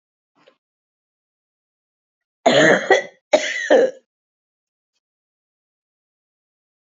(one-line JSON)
{"cough_length": "6.8 s", "cough_amplitude": 27635, "cough_signal_mean_std_ratio": 0.29, "survey_phase": "beta (2021-08-13 to 2022-03-07)", "age": "65+", "gender": "Female", "wearing_mask": "No", "symptom_cough_any": true, "symptom_runny_or_blocked_nose": true, "symptom_sore_throat": true, "symptom_fatigue": true, "symptom_headache": true, "symptom_other": true, "smoker_status": "Never smoked", "respiratory_condition_asthma": false, "respiratory_condition_other": false, "recruitment_source": "Test and Trace", "submission_delay": "2 days", "covid_test_result": "Positive", "covid_test_method": "ePCR"}